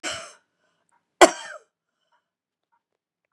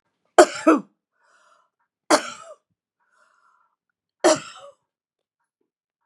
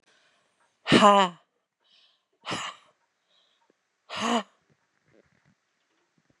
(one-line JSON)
{"cough_length": "3.3 s", "cough_amplitude": 32767, "cough_signal_mean_std_ratio": 0.15, "three_cough_length": "6.1 s", "three_cough_amplitude": 32767, "three_cough_signal_mean_std_ratio": 0.22, "exhalation_length": "6.4 s", "exhalation_amplitude": 23851, "exhalation_signal_mean_std_ratio": 0.24, "survey_phase": "beta (2021-08-13 to 2022-03-07)", "age": "65+", "gender": "Female", "wearing_mask": "No", "symptom_none": true, "symptom_onset": "11 days", "smoker_status": "Never smoked", "respiratory_condition_asthma": false, "respiratory_condition_other": false, "recruitment_source": "REACT", "submission_delay": "0 days", "covid_test_result": "Negative", "covid_test_method": "RT-qPCR"}